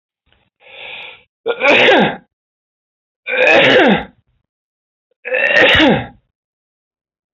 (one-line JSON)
{"three_cough_length": "7.3 s", "three_cough_amplitude": 31795, "three_cough_signal_mean_std_ratio": 0.46, "survey_phase": "alpha (2021-03-01 to 2021-08-12)", "age": "65+", "gender": "Male", "wearing_mask": "No", "symptom_none": true, "smoker_status": "Never smoked", "respiratory_condition_asthma": false, "respiratory_condition_other": false, "recruitment_source": "REACT", "submission_delay": "8 days", "covid_test_result": "Negative", "covid_test_method": "RT-qPCR"}